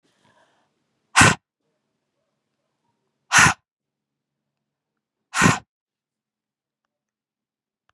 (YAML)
exhalation_length: 7.9 s
exhalation_amplitude: 32735
exhalation_signal_mean_std_ratio: 0.21
survey_phase: beta (2021-08-13 to 2022-03-07)
age: 45-64
gender: Female
wearing_mask: 'Yes'
symptom_runny_or_blocked_nose: true
symptom_shortness_of_breath: true
symptom_sore_throat: true
symptom_fatigue: true
symptom_onset: 5 days
smoker_status: Never smoked
respiratory_condition_asthma: false
respiratory_condition_other: false
recruitment_source: Test and Trace
submission_delay: 2 days
covid_test_result: Positive
covid_test_method: ePCR